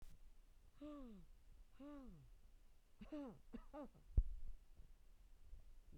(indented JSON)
{
  "three_cough_length": "6.0 s",
  "three_cough_amplitude": 2044,
  "three_cough_signal_mean_std_ratio": 0.46,
  "survey_phase": "beta (2021-08-13 to 2022-03-07)",
  "age": "45-64",
  "gender": "Female",
  "wearing_mask": "No",
  "symptom_none": true,
  "smoker_status": "Never smoked",
  "respiratory_condition_asthma": false,
  "respiratory_condition_other": false,
  "recruitment_source": "REACT",
  "submission_delay": "1 day",
  "covid_test_result": "Negative",
  "covid_test_method": "RT-qPCR"
}